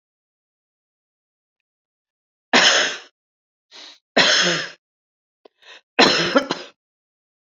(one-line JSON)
{"three_cough_length": "7.6 s", "three_cough_amplitude": 31793, "three_cough_signal_mean_std_ratio": 0.33, "survey_phase": "beta (2021-08-13 to 2022-03-07)", "age": "45-64", "gender": "Female", "wearing_mask": "No", "symptom_none": true, "smoker_status": "Never smoked", "respiratory_condition_asthma": false, "respiratory_condition_other": false, "recruitment_source": "REACT", "submission_delay": "1 day", "covid_test_result": "Negative", "covid_test_method": "RT-qPCR"}